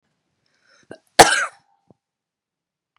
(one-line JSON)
{"cough_length": "3.0 s", "cough_amplitude": 32768, "cough_signal_mean_std_ratio": 0.19, "survey_phase": "beta (2021-08-13 to 2022-03-07)", "age": "18-44", "gender": "Female", "wearing_mask": "No", "symptom_runny_or_blocked_nose": true, "symptom_diarrhoea": true, "symptom_change_to_sense_of_smell_or_taste": true, "smoker_status": "Current smoker (1 to 10 cigarettes per day)", "respiratory_condition_asthma": false, "respiratory_condition_other": false, "recruitment_source": "Test and Trace", "submission_delay": "2 days", "covid_test_result": "Positive", "covid_test_method": "RT-qPCR", "covid_ct_value": 18.6, "covid_ct_gene": "ORF1ab gene"}